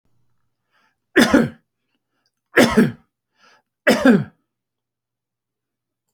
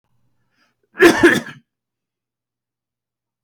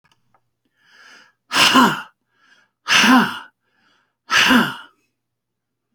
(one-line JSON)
{"three_cough_length": "6.1 s", "three_cough_amplitude": 29479, "three_cough_signal_mean_std_ratio": 0.31, "cough_length": "3.4 s", "cough_amplitude": 29182, "cough_signal_mean_std_ratio": 0.26, "exhalation_length": "5.9 s", "exhalation_amplitude": 32303, "exhalation_signal_mean_std_ratio": 0.39, "survey_phase": "alpha (2021-03-01 to 2021-08-12)", "age": "65+", "gender": "Male", "wearing_mask": "No", "symptom_none": true, "smoker_status": "Never smoked", "respiratory_condition_asthma": false, "respiratory_condition_other": false, "recruitment_source": "REACT", "submission_delay": "3 days", "covid_test_result": "Negative", "covid_test_method": "RT-qPCR"}